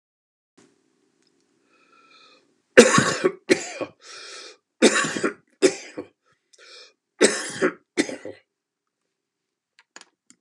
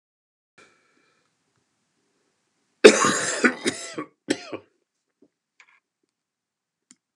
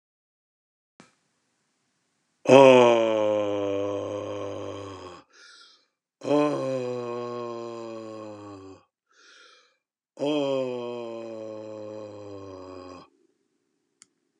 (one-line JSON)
{"three_cough_length": "10.4 s", "three_cough_amplitude": 32768, "three_cough_signal_mean_std_ratio": 0.28, "cough_length": "7.2 s", "cough_amplitude": 32768, "cough_signal_mean_std_ratio": 0.21, "exhalation_length": "14.4 s", "exhalation_amplitude": 27915, "exhalation_signal_mean_std_ratio": 0.38, "survey_phase": "beta (2021-08-13 to 2022-03-07)", "age": "65+", "gender": "Male", "wearing_mask": "No", "symptom_cough_any": true, "symptom_runny_or_blocked_nose": true, "smoker_status": "Never smoked", "respiratory_condition_asthma": false, "respiratory_condition_other": false, "recruitment_source": "REACT", "submission_delay": "3 days", "covid_test_result": "Negative", "covid_test_method": "RT-qPCR", "influenza_a_test_result": "Negative", "influenza_b_test_result": "Negative"}